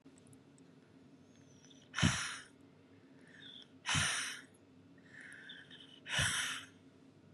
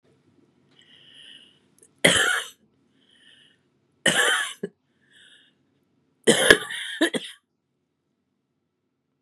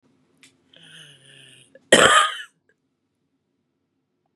exhalation_length: 7.3 s
exhalation_amplitude: 4755
exhalation_signal_mean_std_ratio: 0.43
three_cough_length: 9.2 s
three_cough_amplitude: 32768
three_cough_signal_mean_std_ratio: 0.3
cough_length: 4.4 s
cough_amplitude: 32677
cough_signal_mean_std_ratio: 0.25
survey_phase: beta (2021-08-13 to 2022-03-07)
age: 45-64
gender: Female
wearing_mask: 'No'
symptom_cough_any: true
symptom_runny_or_blocked_nose: true
symptom_shortness_of_breath: true
symptom_diarrhoea: true
symptom_fatigue: true
symptom_headache: true
symptom_change_to_sense_of_smell_or_taste: true
symptom_onset: 8 days
smoker_status: Ex-smoker
respiratory_condition_asthma: false
respiratory_condition_other: true
recruitment_source: Test and Trace
submission_delay: 1 day
covid_test_result: Positive
covid_test_method: RT-qPCR
covid_ct_value: 17.7
covid_ct_gene: ORF1ab gene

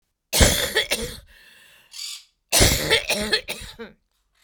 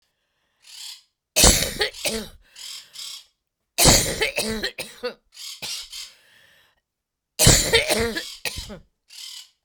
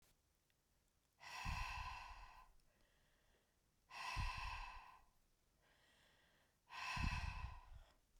cough_length: 4.4 s
cough_amplitude: 32767
cough_signal_mean_std_ratio: 0.47
three_cough_length: 9.6 s
three_cough_amplitude: 32768
three_cough_signal_mean_std_ratio: 0.4
exhalation_length: 8.2 s
exhalation_amplitude: 1090
exhalation_signal_mean_std_ratio: 0.51
survey_phase: beta (2021-08-13 to 2022-03-07)
age: 45-64
gender: Female
wearing_mask: 'No'
symptom_cough_any: true
symptom_runny_or_blocked_nose: true
symptom_shortness_of_breath: true
symptom_sore_throat: true
symptom_diarrhoea: true
symptom_fatigue: true
symptom_fever_high_temperature: true
symptom_headache: true
symptom_change_to_sense_of_smell_or_taste: true
symptom_loss_of_taste: true
symptom_onset: 4 days
smoker_status: Never smoked
respiratory_condition_asthma: false
respiratory_condition_other: false
recruitment_source: Test and Trace
submission_delay: 1 day
covid_test_result: Positive
covid_test_method: RT-qPCR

